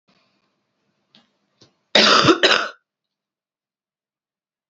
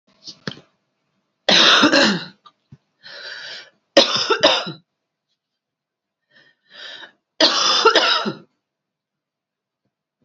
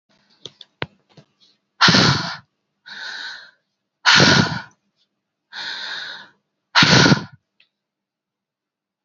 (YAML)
cough_length: 4.7 s
cough_amplitude: 32767
cough_signal_mean_std_ratio: 0.29
three_cough_length: 10.2 s
three_cough_amplitude: 32768
three_cough_signal_mean_std_ratio: 0.38
exhalation_length: 9.0 s
exhalation_amplitude: 29783
exhalation_signal_mean_std_ratio: 0.35
survey_phase: beta (2021-08-13 to 2022-03-07)
age: 18-44
gender: Female
wearing_mask: 'No'
symptom_cough_any: true
symptom_runny_or_blocked_nose: true
symptom_fever_high_temperature: true
symptom_headache: true
symptom_change_to_sense_of_smell_or_taste: true
symptom_loss_of_taste: true
symptom_onset: 5 days
smoker_status: Ex-smoker
respiratory_condition_asthma: false
respiratory_condition_other: false
recruitment_source: Test and Trace
submission_delay: 2 days
covid_test_result: Positive
covid_test_method: RT-qPCR
covid_ct_value: 26.8
covid_ct_gene: ORF1ab gene